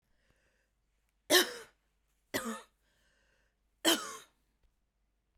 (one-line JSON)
{"three_cough_length": "5.4 s", "three_cough_amplitude": 10297, "three_cough_signal_mean_std_ratio": 0.24, "survey_phase": "beta (2021-08-13 to 2022-03-07)", "age": "18-44", "gender": "Female", "wearing_mask": "No", "symptom_cough_any": true, "symptom_new_continuous_cough": true, "symptom_sore_throat": true, "symptom_fatigue": true, "symptom_headache": true, "symptom_onset": "3 days", "smoker_status": "Never smoked", "respiratory_condition_asthma": false, "respiratory_condition_other": false, "recruitment_source": "Test and Trace", "submission_delay": "0 days", "covid_test_result": "Positive", "covid_test_method": "LAMP"}